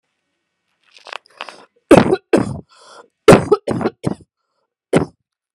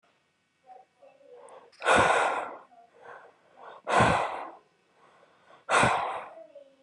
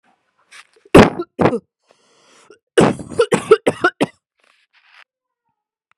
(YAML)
three_cough_length: 5.5 s
three_cough_amplitude: 32768
three_cough_signal_mean_std_ratio: 0.3
exhalation_length: 6.8 s
exhalation_amplitude: 11277
exhalation_signal_mean_std_ratio: 0.42
cough_length: 6.0 s
cough_amplitude: 32768
cough_signal_mean_std_ratio: 0.29
survey_phase: beta (2021-08-13 to 2022-03-07)
age: 18-44
gender: Female
wearing_mask: 'No'
symptom_shortness_of_breath: true
symptom_fatigue: true
symptom_headache: true
symptom_onset: 13 days
smoker_status: Never smoked
respiratory_condition_asthma: false
respiratory_condition_other: false
recruitment_source: REACT
submission_delay: 0 days
covid_test_result: Negative
covid_test_method: RT-qPCR
covid_ct_value: 44.0
covid_ct_gene: N gene